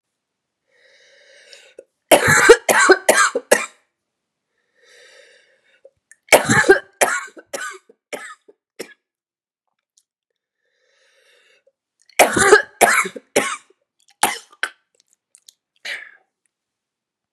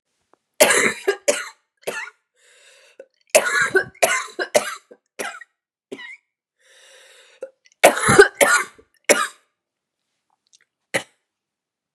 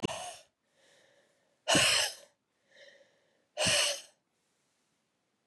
three_cough_length: 17.3 s
three_cough_amplitude: 32768
three_cough_signal_mean_std_ratio: 0.3
cough_length: 11.9 s
cough_amplitude: 32768
cough_signal_mean_std_ratio: 0.33
exhalation_length: 5.5 s
exhalation_amplitude: 7866
exhalation_signal_mean_std_ratio: 0.35
survey_phase: beta (2021-08-13 to 2022-03-07)
age: 18-44
gender: Female
wearing_mask: 'No'
symptom_cough_any: true
symptom_runny_or_blocked_nose: true
symptom_shortness_of_breath: true
symptom_fatigue: true
symptom_headache: true
symptom_change_to_sense_of_smell_or_taste: true
symptom_loss_of_taste: true
smoker_status: Never smoked
respiratory_condition_asthma: true
respiratory_condition_other: false
recruitment_source: Test and Trace
submission_delay: 2 days
covid_test_result: Positive
covid_test_method: RT-qPCR
covid_ct_value: 16.3
covid_ct_gene: ORF1ab gene
covid_ct_mean: 16.9
covid_viral_load: 2800000 copies/ml
covid_viral_load_category: High viral load (>1M copies/ml)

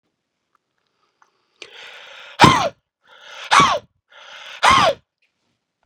exhalation_length: 5.9 s
exhalation_amplitude: 32768
exhalation_signal_mean_std_ratio: 0.31
survey_phase: beta (2021-08-13 to 2022-03-07)
age: 18-44
gender: Male
wearing_mask: 'No'
symptom_none: true
smoker_status: Never smoked
recruitment_source: REACT
submission_delay: 2 days
covid_test_result: Negative
covid_test_method: RT-qPCR
influenza_a_test_result: Unknown/Void
influenza_b_test_result: Unknown/Void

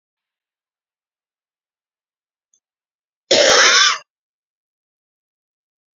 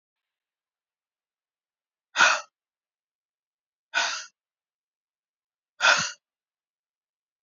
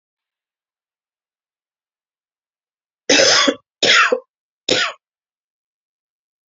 cough_length: 6.0 s
cough_amplitude: 32767
cough_signal_mean_std_ratio: 0.27
exhalation_length: 7.4 s
exhalation_amplitude: 18757
exhalation_signal_mean_std_ratio: 0.23
three_cough_length: 6.5 s
three_cough_amplitude: 31625
three_cough_signal_mean_std_ratio: 0.31
survey_phase: beta (2021-08-13 to 2022-03-07)
age: 18-44
gender: Female
wearing_mask: 'No'
symptom_cough_any: true
symptom_new_continuous_cough: true
symptom_runny_or_blocked_nose: true
symptom_headache: true
symptom_change_to_sense_of_smell_or_taste: true
symptom_loss_of_taste: true
symptom_onset: 3 days
smoker_status: Never smoked
respiratory_condition_asthma: false
respiratory_condition_other: false
recruitment_source: Test and Trace
submission_delay: 1 day
covid_test_result: Positive
covid_test_method: ePCR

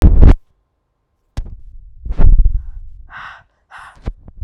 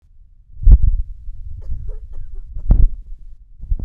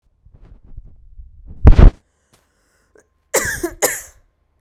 exhalation_length: 4.4 s
exhalation_amplitude: 32768
exhalation_signal_mean_std_ratio: 0.4
three_cough_length: 3.8 s
three_cough_amplitude: 32768
three_cough_signal_mean_std_ratio: 0.49
cough_length: 4.6 s
cough_amplitude: 32768
cough_signal_mean_std_ratio: 0.27
survey_phase: beta (2021-08-13 to 2022-03-07)
age: 18-44
gender: Female
wearing_mask: 'No'
symptom_cough_any: true
symptom_runny_or_blocked_nose: true
symptom_sore_throat: true
symptom_fatigue: true
symptom_fever_high_temperature: true
symptom_headache: true
smoker_status: Never smoked
respiratory_condition_asthma: false
respiratory_condition_other: false
recruitment_source: Test and Trace
submission_delay: 2 days
covid_test_result: Positive
covid_test_method: LFT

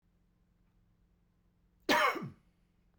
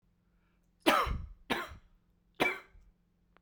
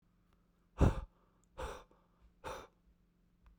cough_length: 3.0 s
cough_amplitude: 5507
cough_signal_mean_std_ratio: 0.28
three_cough_length: 3.4 s
three_cough_amplitude: 10803
three_cough_signal_mean_std_ratio: 0.35
exhalation_length: 3.6 s
exhalation_amplitude: 5634
exhalation_signal_mean_std_ratio: 0.25
survey_phase: beta (2021-08-13 to 2022-03-07)
age: 45-64
gender: Male
wearing_mask: 'No'
symptom_none: true
smoker_status: Never smoked
respiratory_condition_asthma: false
respiratory_condition_other: false
recruitment_source: REACT
submission_delay: 3 days
covid_test_result: Negative
covid_test_method: RT-qPCR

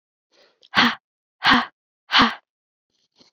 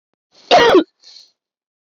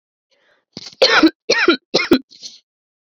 exhalation_length: 3.3 s
exhalation_amplitude: 24919
exhalation_signal_mean_std_ratio: 0.33
cough_length: 1.9 s
cough_amplitude: 29278
cough_signal_mean_std_ratio: 0.36
three_cough_length: 3.1 s
three_cough_amplitude: 29641
three_cough_signal_mean_std_ratio: 0.4
survey_phase: beta (2021-08-13 to 2022-03-07)
age: 18-44
gender: Female
wearing_mask: 'No'
symptom_cough_any: true
symptom_runny_or_blocked_nose: true
symptom_sore_throat: true
symptom_headache: true
symptom_change_to_sense_of_smell_or_taste: true
smoker_status: Never smoked
respiratory_condition_asthma: false
respiratory_condition_other: false
recruitment_source: Test and Trace
submission_delay: 1 day
covid_test_result: Positive
covid_test_method: RT-qPCR
covid_ct_value: 18.9
covid_ct_gene: ORF1ab gene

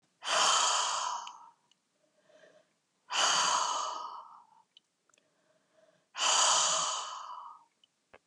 exhalation_length: 8.3 s
exhalation_amplitude: 6361
exhalation_signal_mean_std_ratio: 0.52
survey_phase: beta (2021-08-13 to 2022-03-07)
age: 65+
gender: Female
wearing_mask: 'No'
symptom_none: true
smoker_status: Never smoked
respiratory_condition_asthma: false
respiratory_condition_other: false
recruitment_source: REACT
submission_delay: 2 days
covid_test_result: Negative
covid_test_method: RT-qPCR
influenza_a_test_result: Negative
influenza_b_test_result: Negative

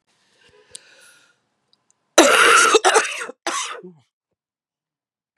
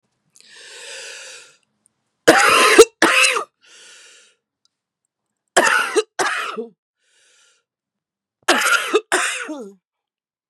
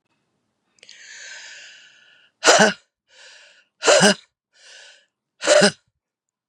cough_length: 5.4 s
cough_amplitude: 32768
cough_signal_mean_std_ratio: 0.36
three_cough_length: 10.5 s
three_cough_amplitude: 32768
three_cough_signal_mean_std_ratio: 0.38
exhalation_length: 6.5 s
exhalation_amplitude: 32763
exhalation_signal_mean_std_ratio: 0.31
survey_phase: beta (2021-08-13 to 2022-03-07)
age: 45-64
gender: Female
wearing_mask: 'No'
symptom_cough_any: true
symptom_runny_or_blocked_nose: true
symptom_fatigue: true
symptom_headache: true
symptom_other: true
smoker_status: Current smoker (e-cigarettes or vapes only)
respiratory_condition_asthma: false
respiratory_condition_other: false
recruitment_source: Test and Trace
submission_delay: 2 days
covid_test_result: Positive
covid_test_method: RT-qPCR
covid_ct_value: 14.6
covid_ct_gene: ORF1ab gene
covid_ct_mean: 15.4
covid_viral_load: 9100000 copies/ml
covid_viral_load_category: High viral load (>1M copies/ml)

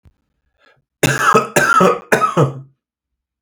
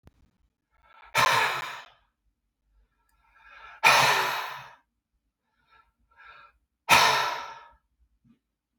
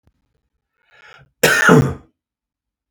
three_cough_length: 3.4 s
three_cough_amplitude: 32768
three_cough_signal_mean_std_ratio: 0.5
exhalation_length: 8.8 s
exhalation_amplitude: 21769
exhalation_signal_mean_std_ratio: 0.35
cough_length: 2.9 s
cough_amplitude: 32768
cough_signal_mean_std_ratio: 0.32
survey_phase: beta (2021-08-13 to 2022-03-07)
age: 45-64
gender: Male
wearing_mask: 'No'
symptom_cough_any: true
symptom_runny_or_blocked_nose: true
symptom_fatigue: true
symptom_headache: true
smoker_status: Never smoked
respiratory_condition_asthma: false
respiratory_condition_other: false
recruitment_source: REACT
submission_delay: 6 days
covid_test_result: Negative
covid_test_method: RT-qPCR
influenza_a_test_result: Negative
influenza_b_test_result: Negative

